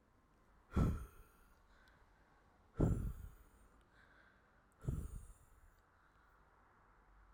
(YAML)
exhalation_length: 7.3 s
exhalation_amplitude: 2353
exhalation_signal_mean_std_ratio: 0.33
survey_phase: alpha (2021-03-01 to 2021-08-12)
age: 18-44
gender: Male
wearing_mask: 'No'
symptom_cough_any: true
symptom_fatigue: true
symptom_change_to_sense_of_smell_or_taste: true
symptom_loss_of_taste: true
symptom_onset: 4 days
smoker_status: Never smoked
respiratory_condition_asthma: false
respiratory_condition_other: false
recruitment_source: Test and Trace
submission_delay: 2 days
covid_test_result: Positive
covid_test_method: RT-qPCR